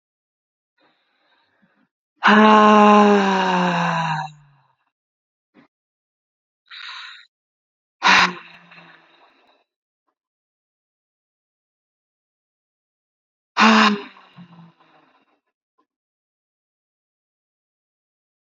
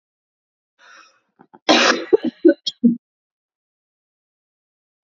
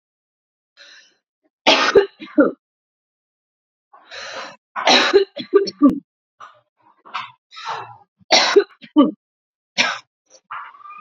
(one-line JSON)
{"exhalation_length": "18.5 s", "exhalation_amplitude": 28900, "exhalation_signal_mean_std_ratio": 0.3, "cough_length": "5.0 s", "cough_amplitude": 29954, "cough_signal_mean_std_ratio": 0.28, "three_cough_length": "11.0 s", "three_cough_amplitude": 32094, "three_cough_signal_mean_std_ratio": 0.35, "survey_phase": "beta (2021-08-13 to 2022-03-07)", "age": "18-44", "gender": "Female", "wearing_mask": "No", "symptom_runny_or_blocked_nose": true, "symptom_onset": "3 days", "smoker_status": "Ex-smoker", "respiratory_condition_asthma": false, "respiratory_condition_other": false, "recruitment_source": "Test and Trace", "submission_delay": "2 days", "covid_test_result": "Positive", "covid_test_method": "RT-qPCR", "covid_ct_value": 28.7, "covid_ct_gene": "ORF1ab gene", "covid_ct_mean": 29.2, "covid_viral_load": "270 copies/ml", "covid_viral_load_category": "Minimal viral load (< 10K copies/ml)"}